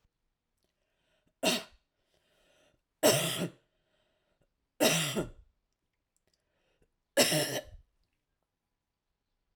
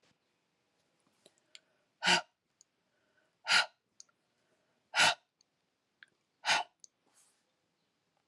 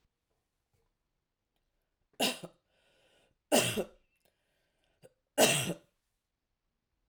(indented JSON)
{
  "cough_length": "9.6 s",
  "cough_amplitude": 10058,
  "cough_signal_mean_std_ratio": 0.3,
  "exhalation_length": "8.3 s",
  "exhalation_amplitude": 7631,
  "exhalation_signal_mean_std_ratio": 0.23,
  "three_cough_length": "7.1 s",
  "three_cough_amplitude": 8664,
  "three_cough_signal_mean_std_ratio": 0.25,
  "survey_phase": "alpha (2021-03-01 to 2021-08-12)",
  "age": "65+",
  "gender": "Female",
  "wearing_mask": "No",
  "symptom_cough_any": true,
  "smoker_status": "Never smoked",
  "respiratory_condition_asthma": false,
  "respiratory_condition_other": false,
  "recruitment_source": "REACT",
  "submission_delay": "1 day",
  "covid_test_result": "Negative",
  "covid_test_method": "RT-qPCR"
}